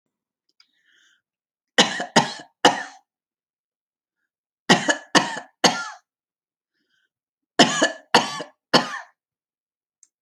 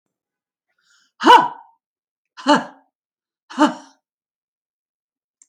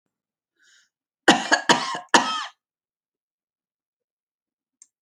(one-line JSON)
{"three_cough_length": "10.2 s", "three_cough_amplitude": 32676, "three_cough_signal_mean_std_ratio": 0.29, "exhalation_length": "5.5 s", "exhalation_amplitude": 31709, "exhalation_signal_mean_std_ratio": 0.24, "cough_length": "5.0 s", "cough_amplitude": 28231, "cough_signal_mean_std_ratio": 0.26, "survey_phase": "beta (2021-08-13 to 2022-03-07)", "age": "65+", "gender": "Female", "wearing_mask": "No", "symptom_none": true, "smoker_status": "Never smoked", "respiratory_condition_asthma": true, "respiratory_condition_other": false, "recruitment_source": "REACT", "submission_delay": "3 days", "covid_test_result": "Negative", "covid_test_method": "RT-qPCR"}